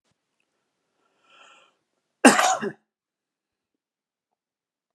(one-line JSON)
{"cough_length": "4.9 s", "cough_amplitude": 32020, "cough_signal_mean_std_ratio": 0.19, "survey_phase": "alpha (2021-03-01 to 2021-08-12)", "age": "45-64", "gender": "Male", "wearing_mask": "No", "symptom_none": true, "smoker_status": "Never smoked", "respiratory_condition_asthma": false, "respiratory_condition_other": false, "recruitment_source": "REACT", "submission_delay": "2 days", "covid_test_result": "Negative", "covid_test_method": "RT-qPCR"}